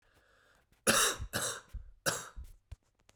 {
  "three_cough_length": "3.2 s",
  "three_cough_amplitude": 7057,
  "three_cough_signal_mean_std_ratio": 0.41,
  "survey_phase": "beta (2021-08-13 to 2022-03-07)",
  "age": "18-44",
  "gender": "Male",
  "wearing_mask": "No",
  "symptom_cough_any": true,
  "symptom_new_continuous_cough": true,
  "symptom_runny_or_blocked_nose": true,
  "symptom_sore_throat": true,
  "symptom_fatigue": true,
  "symptom_headache": true,
  "symptom_onset": "2 days",
  "smoker_status": "Never smoked",
  "respiratory_condition_asthma": false,
  "respiratory_condition_other": false,
  "recruitment_source": "Test and Trace",
  "submission_delay": "2 days",
  "covid_test_result": "Positive",
  "covid_test_method": "RT-qPCR",
  "covid_ct_value": 31.0,
  "covid_ct_gene": "N gene"
}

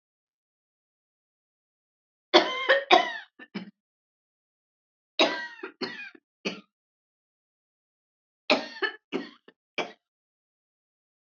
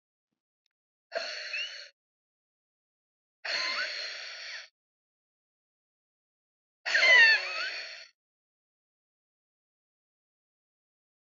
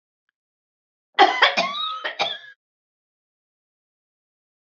{
  "three_cough_length": "11.3 s",
  "three_cough_amplitude": 24726,
  "three_cough_signal_mean_std_ratio": 0.25,
  "exhalation_length": "11.3 s",
  "exhalation_amplitude": 10742,
  "exhalation_signal_mean_std_ratio": 0.29,
  "cough_length": "4.8 s",
  "cough_amplitude": 27332,
  "cough_signal_mean_std_ratio": 0.3,
  "survey_phase": "beta (2021-08-13 to 2022-03-07)",
  "age": "65+",
  "gender": "Female",
  "wearing_mask": "No",
  "symptom_none": true,
  "symptom_onset": "12 days",
  "smoker_status": "Never smoked",
  "respiratory_condition_asthma": true,
  "respiratory_condition_other": false,
  "recruitment_source": "REACT",
  "submission_delay": "4 days",
  "covid_test_result": "Negative",
  "covid_test_method": "RT-qPCR"
}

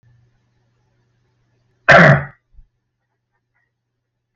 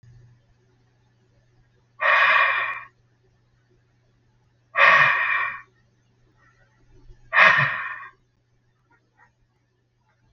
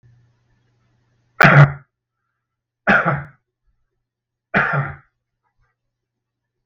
{
  "cough_length": "4.4 s",
  "cough_amplitude": 32768,
  "cough_signal_mean_std_ratio": 0.23,
  "exhalation_length": "10.3 s",
  "exhalation_amplitude": 32766,
  "exhalation_signal_mean_std_ratio": 0.35,
  "three_cough_length": "6.7 s",
  "three_cough_amplitude": 32768,
  "three_cough_signal_mean_std_ratio": 0.28,
  "survey_phase": "beta (2021-08-13 to 2022-03-07)",
  "age": "65+",
  "gender": "Male",
  "wearing_mask": "No",
  "symptom_none": true,
  "smoker_status": "Never smoked",
  "respiratory_condition_asthma": false,
  "respiratory_condition_other": false,
  "recruitment_source": "REACT",
  "submission_delay": "1 day",
  "covid_test_result": "Negative",
  "covid_test_method": "RT-qPCR"
}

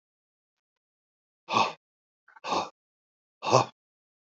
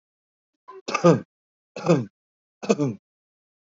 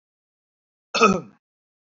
{
  "exhalation_length": "4.4 s",
  "exhalation_amplitude": 20701,
  "exhalation_signal_mean_std_ratio": 0.26,
  "three_cough_length": "3.8 s",
  "three_cough_amplitude": 22914,
  "three_cough_signal_mean_std_ratio": 0.31,
  "cough_length": "1.9 s",
  "cough_amplitude": 23977,
  "cough_signal_mean_std_ratio": 0.27,
  "survey_phase": "beta (2021-08-13 to 2022-03-07)",
  "age": "45-64",
  "gender": "Male",
  "wearing_mask": "No",
  "symptom_none": true,
  "smoker_status": "Current smoker (1 to 10 cigarettes per day)",
  "respiratory_condition_asthma": false,
  "respiratory_condition_other": false,
  "recruitment_source": "REACT",
  "submission_delay": "2 days",
  "covid_test_result": "Negative",
  "covid_test_method": "RT-qPCR",
  "influenza_a_test_result": "Negative",
  "influenza_b_test_result": "Negative"
}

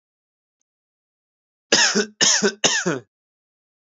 {
  "three_cough_length": "3.8 s",
  "three_cough_amplitude": 28145,
  "three_cough_signal_mean_std_ratio": 0.39,
  "survey_phase": "alpha (2021-03-01 to 2021-08-12)",
  "age": "18-44",
  "gender": "Male",
  "wearing_mask": "No",
  "symptom_change_to_sense_of_smell_or_taste": true,
  "symptom_loss_of_taste": true,
  "symptom_onset": "8 days",
  "smoker_status": "Current smoker (1 to 10 cigarettes per day)",
  "recruitment_source": "Test and Trace",
  "submission_delay": "6 days",
  "covid_test_result": "Positive",
  "covid_test_method": "RT-qPCR",
  "covid_ct_value": 33.2,
  "covid_ct_gene": "ORF1ab gene",
  "covid_ct_mean": 33.2,
  "covid_viral_load": "13 copies/ml",
  "covid_viral_load_category": "Minimal viral load (< 10K copies/ml)"
}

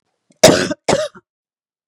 {
  "cough_length": "1.9 s",
  "cough_amplitude": 32768,
  "cough_signal_mean_std_ratio": 0.35,
  "survey_phase": "beta (2021-08-13 to 2022-03-07)",
  "age": "45-64",
  "gender": "Female",
  "wearing_mask": "No",
  "symptom_cough_any": true,
  "symptom_runny_or_blocked_nose": true,
  "symptom_other": true,
  "symptom_onset": "3 days",
  "smoker_status": "Never smoked",
  "respiratory_condition_asthma": false,
  "respiratory_condition_other": false,
  "recruitment_source": "Test and Trace",
  "submission_delay": "2 days",
  "covid_test_result": "Positive",
  "covid_test_method": "RT-qPCR",
  "covid_ct_value": 17.1,
  "covid_ct_gene": "ORF1ab gene",
  "covid_ct_mean": 17.5,
  "covid_viral_load": "1800000 copies/ml",
  "covid_viral_load_category": "High viral load (>1M copies/ml)"
}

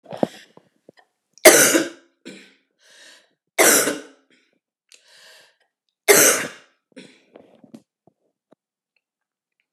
{
  "three_cough_length": "9.7 s",
  "three_cough_amplitude": 32768,
  "three_cough_signal_mean_std_ratio": 0.27,
  "survey_phase": "beta (2021-08-13 to 2022-03-07)",
  "age": "45-64",
  "gender": "Female",
  "wearing_mask": "No",
  "symptom_cough_any": true,
  "symptom_runny_or_blocked_nose": true,
  "symptom_sore_throat": true,
  "symptom_fatigue": true,
  "symptom_fever_high_temperature": true,
  "symptom_headache": true,
  "symptom_onset": "3 days",
  "smoker_status": "Never smoked",
  "respiratory_condition_asthma": false,
  "respiratory_condition_other": false,
  "recruitment_source": "Test and Trace",
  "submission_delay": "2 days",
  "covid_test_result": "Positive",
  "covid_test_method": "RT-qPCR",
  "covid_ct_value": 21.2,
  "covid_ct_gene": "ORF1ab gene",
  "covid_ct_mean": 21.8,
  "covid_viral_load": "69000 copies/ml",
  "covid_viral_load_category": "Low viral load (10K-1M copies/ml)"
}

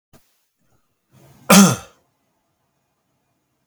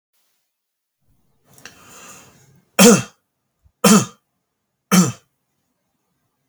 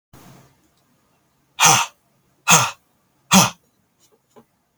{
  "cough_length": "3.7 s",
  "cough_amplitude": 32768,
  "cough_signal_mean_std_ratio": 0.22,
  "three_cough_length": "6.5 s",
  "three_cough_amplitude": 32768,
  "three_cough_signal_mean_std_ratio": 0.25,
  "exhalation_length": "4.8 s",
  "exhalation_amplitude": 32768,
  "exhalation_signal_mean_std_ratio": 0.29,
  "survey_phase": "alpha (2021-03-01 to 2021-08-12)",
  "age": "45-64",
  "gender": "Male",
  "wearing_mask": "No",
  "symptom_fatigue": true,
  "smoker_status": "Never smoked",
  "respiratory_condition_asthma": false,
  "respiratory_condition_other": false,
  "recruitment_source": "Test and Trace",
  "submission_delay": "1 day",
  "covid_test_result": "Positive",
  "covid_test_method": "RT-qPCR",
  "covid_ct_value": 22.3,
  "covid_ct_gene": "ORF1ab gene"
}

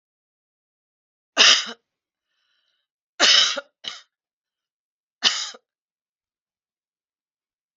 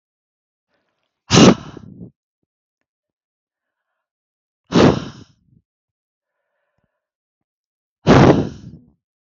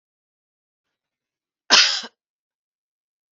{
  "three_cough_length": "7.8 s",
  "three_cough_amplitude": 32282,
  "three_cough_signal_mean_std_ratio": 0.25,
  "exhalation_length": "9.2 s",
  "exhalation_amplitude": 32768,
  "exhalation_signal_mean_std_ratio": 0.25,
  "cough_length": "3.3 s",
  "cough_amplitude": 32768,
  "cough_signal_mean_std_ratio": 0.21,
  "survey_phase": "beta (2021-08-13 to 2022-03-07)",
  "age": "65+",
  "gender": "Female",
  "wearing_mask": "No",
  "symptom_none": true,
  "symptom_onset": "3 days",
  "smoker_status": "Never smoked",
  "respiratory_condition_asthma": false,
  "respiratory_condition_other": false,
  "recruitment_source": "REACT",
  "submission_delay": "-13 days",
  "covid_test_result": "Negative",
  "covid_test_method": "RT-qPCR",
  "influenza_a_test_result": "Unknown/Void",
  "influenza_b_test_result": "Unknown/Void"
}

